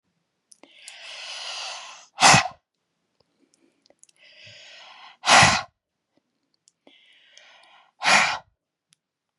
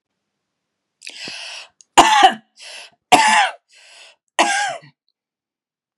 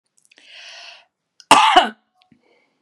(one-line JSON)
{"exhalation_length": "9.4 s", "exhalation_amplitude": 27437, "exhalation_signal_mean_std_ratio": 0.27, "three_cough_length": "6.0 s", "three_cough_amplitude": 32768, "three_cough_signal_mean_std_ratio": 0.35, "cough_length": "2.8 s", "cough_amplitude": 32768, "cough_signal_mean_std_ratio": 0.29, "survey_phase": "beta (2021-08-13 to 2022-03-07)", "age": "45-64", "gender": "Female", "wearing_mask": "No", "symptom_none": true, "smoker_status": "Ex-smoker", "respiratory_condition_asthma": false, "respiratory_condition_other": false, "recruitment_source": "REACT", "submission_delay": "1 day", "covid_test_result": "Negative", "covid_test_method": "RT-qPCR"}